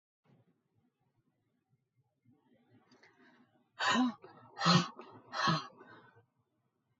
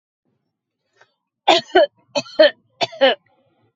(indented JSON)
{
  "exhalation_length": "7.0 s",
  "exhalation_amplitude": 6175,
  "exhalation_signal_mean_std_ratio": 0.3,
  "cough_length": "3.8 s",
  "cough_amplitude": 30513,
  "cough_signal_mean_std_ratio": 0.32,
  "survey_phase": "alpha (2021-03-01 to 2021-08-12)",
  "age": "45-64",
  "gender": "Female",
  "wearing_mask": "No",
  "symptom_none": true,
  "smoker_status": "Never smoked",
  "respiratory_condition_asthma": false,
  "respiratory_condition_other": false,
  "recruitment_source": "REACT",
  "submission_delay": "5 days",
  "covid_test_result": "Negative",
  "covid_test_method": "RT-qPCR"
}